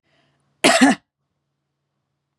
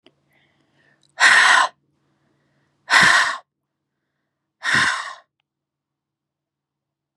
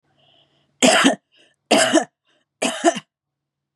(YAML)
cough_length: 2.4 s
cough_amplitude: 32749
cough_signal_mean_std_ratio: 0.28
exhalation_length: 7.2 s
exhalation_amplitude: 31556
exhalation_signal_mean_std_ratio: 0.34
three_cough_length: 3.8 s
three_cough_amplitude: 32283
three_cough_signal_mean_std_ratio: 0.39
survey_phase: beta (2021-08-13 to 2022-03-07)
age: 45-64
gender: Female
wearing_mask: 'No'
symptom_cough_any: true
symptom_new_continuous_cough: true
symptom_runny_or_blocked_nose: true
symptom_shortness_of_breath: true
symptom_fatigue: true
symptom_onset: 3 days
smoker_status: Never smoked
respiratory_condition_asthma: false
respiratory_condition_other: false
recruitment_source: Test and Trace
submission_delay: 2 days
covid_test_result: Positive
covid_test_method: ePCR